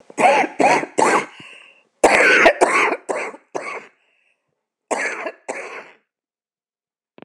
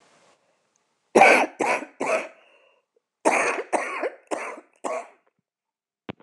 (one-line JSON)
{"cough_length": "7.2 s", "cough_amplitude": 26028, "cough_signal_mean_std_ratio": 0.46, "three_cough_length": "6.2 s", "three_cough_amplitude": 26028, "three_cough_signal_mean_std_ratio": 0.37, "survey_phase": "beta (2021-08-13 to 2022-03-07)", "age": "65+", "gender": "Female", "wearing_mask": "No", "symptom_cough_any": true, "symptom_shortness_of_breath": true, "smoker_status": "Current smoker (1 to 10 cigarettes per day)", "respiratory_condition_asthma": false, "respiratory_condition_other": true, "recruitment_source": "REACT", "submission_delay": "19 days", "covid_test_result": "Negative", "covid_test_method": "RT-qPCR"}